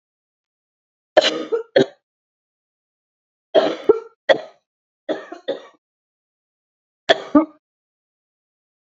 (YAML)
three_cough_length: 8.9 s
three_cough_amplitude: 28797
three_cough_signal_mean_std_ratio: 0.26
survey_phase: beta (2021-08-13 to 2022-03-07)
age: 18-44
gender: Female
wearing_mask: 'No'
symptom_new_continuous_cough: true
symptom_runny_or_blocked_nose: true
symptom_diarrhoea: true
symptom_fatigue: true
symptom_headache: true
symptom_onset: 4 days
smoker_status: Never smoked
respiratory_condition_asthma: true
respiratory_condition_other: false
recruitment_source: Test and Trace
submission_delay: 2 days
covid_test_result: Positive
covid_test_method: RT-qPCR
covid_ct_value: 21.1
covid_ct_gene: ORF1ab gene
covid_ct_mean: 21.5
covid_viral_load: 91000 copies/ml
covid_viral_load_category: Low viral load (10K-1M copies/ml)